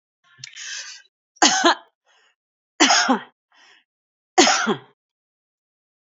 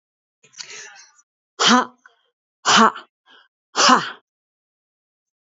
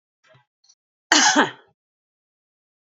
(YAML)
three_cough_length: 6.1 s
three_cough_amplitude: 31427
three_cough_signal_mean_std_ratio: 0.34
exhalation_length: 5.5 s
exhalation_amplitude: 27301
exhalation_signal_mean_std_ratio: 0.31
cough_length: 2.9 s
cough_amplitude: 32768
cough_signal_mean_std_ratio: 0.27
survey_phase: beta (2021-08-13 to 2022-03-07)
age: 65+
gender: Female
wearing_mask: 'No'
symptom_none: true
smoker_status: Ex-smoker
respiratory_condition_asthma: false
respiratory_condition_other: false
recruitment_source: REACT
submission_delay: 1 day
covid_test_result: Negative
covid_test_method: RT-qPCR
influenza_a_test_result: Negative
influenza_b_test_result: Negative